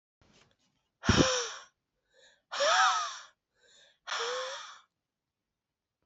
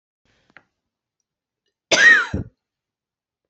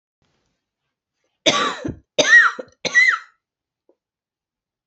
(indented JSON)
{
  "exhalation_length": "6.1 s",
  "exhalation_amplitude": 9945,
  "exhalation_signal_mean_std_ratio": 0.38,
  "cough_length": "3.5 s",
  "cough_amplitude": 31126,
  "cough_signal_mean_std_ratio": 0.27,
  "three_cough_length": "4.9 s",
  "three_cough_amplitude": 27155,
  "three_cough_signal_mean_std_ratio": 0.34,
  "survey_phase": "beta (2021-08-13 to 2022-03-07)",
  "age": "45-64",
  "gender": "Female",
  "wearing_mask": "No",
  "symptom_new_continuous_cough": true,
  "symptom_runny_or_blocked_nose": true,
  "symptom_sore_throat": true,
  "symptom_fatigue": true,
  "symptom_headache": true,
  "symptom_change_to_sense_of_smell_or_taste": true,
  "symptom_loss_of_taste": true,
  "symptom_onset": "5 days",
  "smoker_status": "Ex-smoker",
  "respiratory_condition_asthma": false,
  "respiratory_condition_other": false,
  "recruitment_source": "Test and Trace",
  "submission_delay": "1 day",
  "covid_test_result": "Positive",
  "covid_test_method": "RT-qPCR",
  "covid_ct_value": 17.5,
  "covid_ct_gene": "ORF1ab gene",
  "covid_ct_mean": 18.1,
  "covid_viral_load": "1200000 copies/ml",
  "covid_viral_load_category": "High viral load (>1M copies/ml)"
}